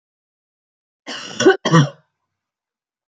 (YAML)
cough_length: 3.1 s
cough_amplitude: 27909
cough_signal_mean_std_ratio: 0.29
survey_phase: beta (2021-08-13 to 2022-03-07)
age: 45-64
gender: Female
wearing_mask: 'No'
symptom_none: true
smoker_status: Never smoked
respiratory_condition_asthma: false
respiratory_condition_other: false
recruitment_source: REACT
submission_delay: 1 day
covid_test_result: Negative
covid_test_method: RT-qPCR
influenza_a_test_result: Negative
influenza_b_test_result: Negative